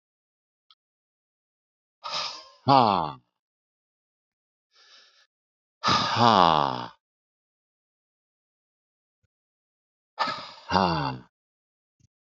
{"exhalation_length": "12.3 s", "exhalation_amplitude": 24085, "exhalation_signal_mean_std_ratio": 0.28, "survey_phase": "beta (2021-08-13 to 2022-03-07)", "age": "65+", "gender": "Male", "wearing_mask": "No", "symptom_cough_any": true, "smoker_status": "Ex-smoker", "respiratory_condition_asthma": false, "respiratory_condition_other": false, "recruitment_source": "REACT", "submission_delay": "1 day", "covid_test_result": "Negative", "covid_test_method": "RT-qPCR", "influenza_a_test_result": "Unknown/Void", "influenza_b_test_result": "Unknown/Void"}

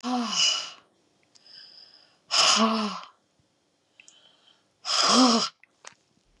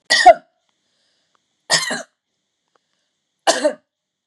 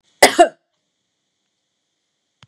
{"exhalation_length": "6.4 s", "exhalation_amplitude": 15838, "exhalation_signal_mean_std_ratio": 0.45, "three_cough_length": "4.3 s", "three_cough_amplitude": 32768, "three_cough_signal_mean_std_ratio": 0.27, "cough_length": "2.5 s", "cough_amplitude": 32768, "cough_signal_mean_std_ratio": 0.21, "survey_phase": "beta (2021-08-13 to 2022-03-07)", "age": "65+", "gender": "Female", "wearing_mask": "No", "symptom_none": true, "smoker_status": "Never smoked", "respiratory_condition_asthma": true, "respiratory_condition_other": false, "recruitment_source": "REACT", "submission_delay": "12 days", "covid_test_result": "Negative", "covid_test_method": "RT-qPCR"}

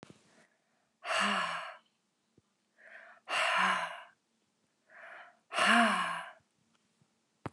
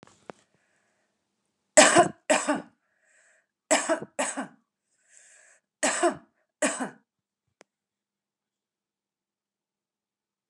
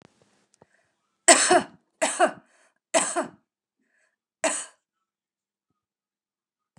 {"exhalation_length": "7.5 s", "exhalation_amplitude": 7432, "exhalation_signal_mean_std_ratio": 0.42, "three_cough_length": "10.5 s", "three_cough_amplitude": 25788, "three_cough_signal_mean_std_ratio": 0.26, "cough_length": "6.8 s", "cough_amplitude": 29182, "cough_signal_mean_std_ratio": 0.27, "survey_phase": "beta (2021-08-13 to 2022-03-07)", "age": "45-64", "gender": "Female", "wearing_mask": "No", "symptom_none": true, "symptom_onset": "3 days", "smoker_status": "Ex-smoker", "respiratory_condition_asthma": false, "respiratory_condition_other": false, "recruitment_source": "Test and Trace", "submission_delay": "1 day", "covid_test_result": "Negative", "covid_test_method": "RT-qPCR"}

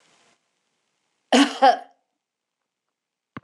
{"cough_length": "3.4 s", "cough_amplitude": 22556, "cough_signal_mean_std_ratio": 0.25, "survey_phase": "beta (2021-08-13 to 2022-03-07)", "age": "65+", "gender": "Female", "wearing_mask": "No", "symptom_none": true, "smoker_status": "Ex-smoker", "respiratory_condition_asthma": false, "respiratory_condition_other": false, "recruitment_source": "REACT", "submission_delay": "2 days", "covid_test_result": "Negative", "covid_test_method": "RT-qPCR", "influenza_a_test_result": "Negative", "influenza_b_test_result": "Negative"}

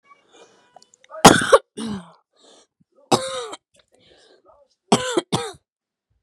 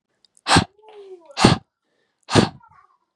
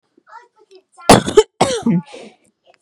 {"three_cough_length": "6.2 s", "three_cough_amplitude": 32768, "three_cough_signal_mean_std_ratio": 0.26, "exhalation_length": "3.2 s", "exhalation_amplitude": 32768, "exhalation_signal_mean_std_ratio": 0.31, "cough_length": "2.8 s", "cough_amplitude": 32768, "cough_signal_mean_std_ratio": 0.34, "survey_phase": "beta (2021-08-13 to 2022-03-07)", "age": "18-44", "gender": "Female", "wearing_mask": "No", "symptom_runny_or_blocked_nose": true, "smoker_status": "Never smoked", "respiratory_condition_asthma": false, "respiratory_condition_other": false, "recruitment_source": "REACT", "submission_delay": "3 days", "covid_test_result": "Negative", "covid_test_method": "RT-qPCR", "influenza_a_test_result": "Negative", "influenza_b_test_result": "Negative"}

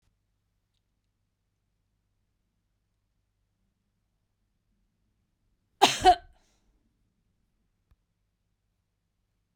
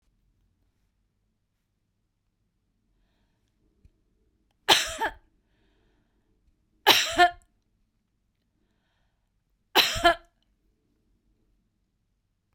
{"cough_length": "9.6 s", "cough_amplitude": 18327, "cough_signal_mean_std_ratio": 0.12, "three_cough_length": "12.5 s", "three_cough_amplitude": 27100, "three_cough_signal_mean_std_ratio": 0.21, "survey_phase": "beta (2021-08-13 to 2022-03-07)", "age": "45-64", "gender": "Female", "wearing_mask": "No", "symptom_none": true, "smoker_status": "Never smoked", "respiratory_condition_asthma": false, "respiratory_condition_other": false, "recruitment_source": "REACT", "submission_delay": "3 days", "covid_test_result": "Negative", "covid_test_method": "RT-qPCR", "influenza_a_test_result": "Negative", "influenza_b_test_result": "Negative"}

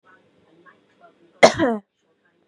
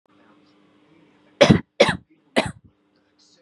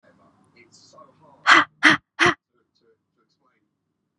{"cough_length": "2.5 s", "cough_amplitude": 32768, "cough_signal_mean_std_ratio": 0.23, "three_cough_length": "3.4 s", "three_cough_amplitude": 32602, "three_cough_signal_mean_std_ratio": 0.25, "exhalation_length": "4.2 s", "exhalation_amplitude": 30988, "exhalation_signal_mean_std_ratio": 0.25, "survey_phase": "beta (2021-08-13 to 2022-03-07)", "age": "18-44", "gender": "Female", "wearing_mask": "No", "symptom_none": true, "smoker_status": "Never smoked", "respiratory_condition_asthma": false, "respiratory_condition_other": false, "recruitment_source": "REACT", "submission_delay": "6 days", "covid_test_result": "Negative", "covid_test_method": "RT-qPCR", "influenza_a_test_result": "Negative", "influenza_b_test_result": "Negative"}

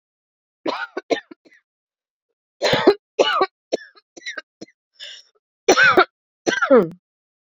{"cough_length": "7.5 s", "cough_amplitude": 29393, "cough_signal_mean_std_ratio": 0.35, "survey_phase": "beta (2021-08-13 to 2022-03-07)", "age": "18-44", "gender": "Female", "wearing_mask": "No", "symptom_cough_any": true, "symptom_shortness_of_breath": true, "symptom_abdominal_pain": true, "symptom_headache": true, "symptom_loss_of_taste": true, "symptom_onset": "2 days", "smoker_status": "Never smoked", "respiratory_condition_asthma": false, "respiratory_condition_other": false, "recruitment_source": "Test and Trace", "submission_delay": "2 days", "covid_test_result": "Positive", "covid_test_method": "RT-qPCR", "covid_ct_value": 15.1, "covid_ct_gene": "N gene", "covid_ct_mean": 15.2, "covid_viral_load": "10000000 copies/ml", "covid_viral_load_category": "High viral load (>1M copies/ml)"}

